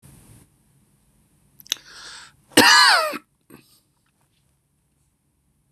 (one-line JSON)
{"cough_length": "5.7 s", "cough_amplitude": 26028, "cough_signal_mean_std_ratio": 0.26, "survey_phase": "beta (2021-08-13 to 2022-03-07)", "age": "45-64", "gender": "Male", "wearing_mask": "No", "symptom_none": true, "smoker_status": "Never smoked", "respiratory_condition_asthma": false, "respiratory_condition_other": false, "recruitment_source": "REACT", "submission_delay": "4 days", "covid_test_result": "Negative", "covid_test_method": "RT-qPCR", "influenza_a_test_result": "Negative", "influenza_b_test_result": "Negative"}